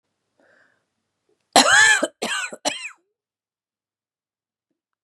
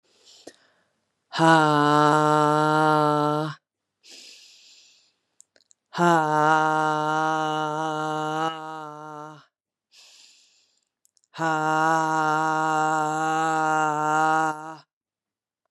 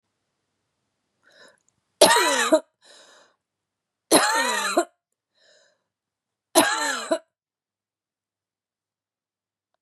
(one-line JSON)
{"cough_length": "5.0 s", "cough_amplitude": 32269, "cough_signal_mean_std_ratio": 0.3, "exhalation_length": "15.7 s", "exhalation_amplitude": 22789, "exhalation_signal_mean_std_ratio": 0.55, "three_cough_length": "9.8 s", "three_cough_amplitude": 28737, "three_cough_signal_mean_std_ratio": 0.32, "survey_phase": "beta (2021-08-13 to 2022-03-07)", "age": "45-64", "gender": "Female", "wearing_mask": "No", "symptom_cough_any": true, "symptom_fatigue": true, "symptom_onset": "5 days", "smoker_status": "Ex-smoker", "respiratory_condition_asthma": false, "respiratory_condition_other": false, "recruitment_source": "Test and Trace", "submission_delay": "2 days", "covid_test_result": "Positive", "covid_test_method": "RT-qPCR", "covid_ct_value": 17.5, "covid_ct_gene": "ORF1ab gene"}